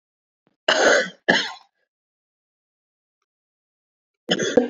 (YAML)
cough_length: 4.7 s
cough_amplitude: 27295
cough_signal_mean_std_ratio: 0.34
survey_phase: beta (2021-08-13 to 2022-03-07)
age: 45-64
gender: Female
wearing_mask: 'No'
symptom_cough_any: true
symptom_runny_or_blocked_nose: true
symptom_sore_throat: true
symptom_abdominal_pain: true
symptom_fatigue: true
symptom_change_to_sense_of_smell_or_taste: true
symptom_loss_of_taste: true
symptom_onset: 3 days
smoker_status: Ex-smoker
respiratory_condition_asthma: false
respiratory_condition_other: false
recruitment_source: Test and Trace
submission_delay: 2 days
covid_test_result: Positive
covid_test_method: ePCR